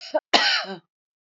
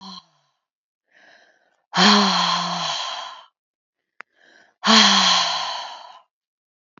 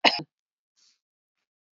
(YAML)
three_cough_length: 1.4 s
three_cough_amplitude: 28374
three_cough_signal_mean_std_ratio: 0.44
exhalation_length: 7.0 s
exhalation_amplitude: 31011
exhalation_signal_mean_std_ratio: 0.44
cough_length: 1.8 s
cough_amplitude: 25839
cough_signal_mean_std_ratio: 0.19
survey_phase: alpha (2021-03-01 to 2021-08-12)
age: 45-64
gender: Female
wearing_mask: 'No'
symptom_none: true
smoker_status: Ex-smoker
respiratory_condition_asthma: false
respiratory_condition_other: false
recruitment_source: REACT
submission_delay: 1 day
covid_test_result: Negative
covid_test_method: RT-qPCR